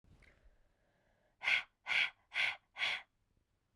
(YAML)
exhalation_length: 3.8 s
exhalation_amplitude: 3709
exhalation_signal_mean_std_ratio: 0.38
survey_phase: beta (2021-08-13 to 2022-03-07)
age: 18-44
gender: Female
wearing_mask: 'No'
symptom_runny_or_blocked_nose: true
symptom_sore_throat: true
symptom_fever_high_temperature: true
symptom_headache: true
smoker_status: Current smoker (e-cigarettes or vapes only)
respiratory_condition_asthma: false
respiratory_condition_other: false
recruitment_source: Test and Trace
submission_delay: 1 day
covid_test_result: Positive
covid_test_method: RT-qPCR